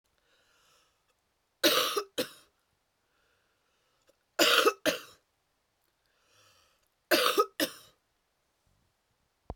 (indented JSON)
{
  "three_cough_length": "9.6 s",
  "three_cough_amplitude": 12597,
  "three_cough_signal_mean_std_ratio": 0.29,
  "survey_phase": "beta (2021-08-13 to 2022-03-07)",
  "age": "18-44",
  "gender": "Female",
  "wearing_mask": "No",
  "symptom_sore_throat": true,
  "smoker_status": "Never smoked",
  "respiratory_condition_asthma": false,
  "respiratory_condition_other": false,
  "recruitment_source": "Test and Trace",
  "submission_delay": "2 days",
  "covid_test_result": "Positive",
  "covid_test_method": "ePCR"
}